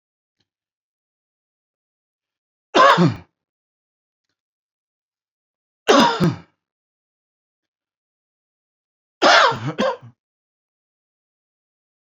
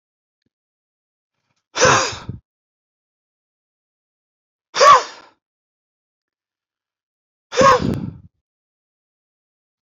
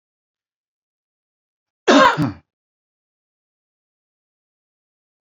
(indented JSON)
{
  "three_cough_length": "12.1 s",
  "three_cough_amplitude": 28285,
  "three_cough_signal_mean_std_ratio": 0.26,
  "exhalation_length": "9.8 s",
  "exhalation_amplitude": 31478,
  "exhalation_signal_mean_std_ratio": 0.25,
  "cough_length": "5.2 s",
  "cough_amplitude": 27885,
  "cough_signal_mean_std_ratio": 0.21,
  "survey_phase": "beta (2021-08-13 to 2022-03-07)",
  "age": "45-64",
  "gender": "Male",
  "wearing_mask": "No",
  "symptom_cough_any": true,
  "symptom_shortness_of_breath": true,
  "symptom_headache": true,
  "symptom_onset": "12 days",
  "smoker_status": "Never smoked",
  "respiratory_condition_asthma": false,
  "respiratory_condition_other": false,
  "recruitment_source": "REACT",
  "submission_delay": "1 day",
  "covid_test_result": "Negative",
  "covid_test_method": "RT-qPCR",
  "influenza_a_test_result": "Negative",
  "influenza_b_test_result": "Negative"
}